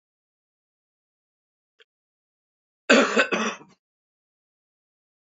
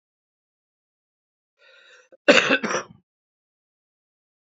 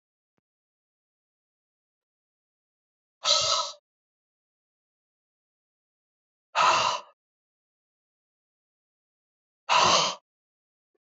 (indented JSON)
{
  "three_cough_length": "5.2 s",
  "three_cough_amplitude": 25093,
  "three_cough_signal_mean_std_ratio": 0.24,
  "cough_length": "4.4 s",
  "cough_amplitude": 26806,
  "cough_signal_mean_std_ratio": 0.22,
  "exhalation_length": "11.2 s",
  "exhalation_amplitude": 15126,
  "exhalation_signal_mean_std_ratio": 0.27,
  "survey_phase": "beta (2021-08-13 to 2022-03-07)",
  "age": "65+",
  "gender": "Male",
  "wearing_mask": "No",
  "symptom_cough_any": true,
  "symptom_sore_throat": true,
  "symptom_fever_high_temperature": true,
  "symptom_headache": true,
  "symptom_other": true,
  "symptom_onset": "4 days",
  "smoker_status": "Never smoked",
  "respiratory_condition_asthma": false,
  "respiratory_condition_other": false,
  "recruitment_source": "Test and Trace",
  "submission_delay": "2 days",
  "covid_test_result": "Positive",
  "covid_test_method": "RT-qPCR"
}